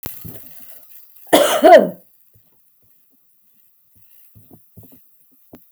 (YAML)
cough_length: 5.7 s
cough_amplitude: 32768
cough_signal_mean_std_ratio: 0.27
survey_phase: beta (2021-08-13 to 2022-03-07)
age: 45-64
gender: Female
wearing_mask: 'No'
symptom_none: true
smoker_status: Ex-smoker
respiratory_condition_asthma: false
respiratory_condition_other: false
recruitment_source: REACT
submission_delay: 1 day
covid_test_result: Negative
covid_test_method: RT-qPCR
influenza_a_test_result: Negative
influenza_b_test_result: Negative